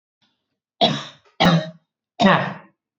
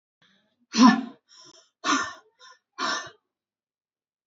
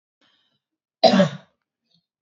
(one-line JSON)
{"three_cough_length": "3.0 s", "three_cough_amplitude": 28275, "three_cough_signal_mean_std_ratio": 0.4, "exhalation_length": "4.3 s", "exhalation_amplitude": 23537, "exhalation_signal_mean_std_ratio": 0.29, "cough_length": "2.2 s", "cough_amplitude": 28065, "cough_signal_mean_std_ratio": 0.27, "survey_phase": "beta (2021-08-13 to 2022-03-07)", "age": "18-44", "gender": "Female", "wearing_mask": "No", "symptom_cough_any": true, "symptom_sore_throat": true, "symptom_fatigue": true, "symptom_headache": true, "symptom_onset": "1 day", "smoker_status": "Never smoked", "respiratory_condition_asthma": false, "respiratory_condition_other": false, "recruitment_source": "Test and Trace", "submission_delay": "1 day", "covid_test_result": "Positive", "covid_test_method": "RT-qPCR", "covid_ct_value": 23.5, "covid_ct_gene": "ORF1ab gene", "covid_ct_mean": 24.0, "covid_viral_load": "14000 copies/ml", "covid_viral_load_category": "Low viral load (10K-1M copies/ml)"}